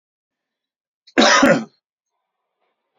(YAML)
cough_length: 3.0 s
cough_amplitude: 28010
cough_signal_mean_std_ratio: 0.31
survey_phase: beta (2021-08-13 to 2022-03-07)
age: 65+
gender: Male
wearing_mask: 'No'
symptom_none: true
smoker_status: Never smoked
respiratory_condition_asthma: false
respiratory_condition_other: false
recruitment_source: REACT
submission_delay: 2 days
covid_test_result: Negative
covid_test_method: RT-qPCR